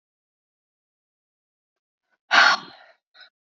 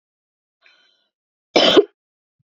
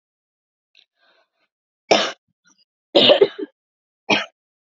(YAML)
exhalation_length: 3.5 s
exhalation_amplitude: 23608
exhalation_signal_mean_std_ratio: 0.22
cough_length: 2.6 s
cough_amplitude: 29692
cough_signal_mean_std_ratio: 0.25
three_cough_length: 4.8 s
three_cough_amplitude: 30552
three_cough_signal_mean_std_ratio: 0.28
survey_phase: beta (2021-08-13 to 2022-03-07)
age: 18-44
gender: Female
wearing_mask: 'No'
symptom_none: true
smoker_status: Never smoked
respiratory_condition_asthma: false
respiratory_condition_other: false
recruitment_source: REACT
submission_delay: 1 day
covid_test_result: Negative
covid_test_method: RT-qPCR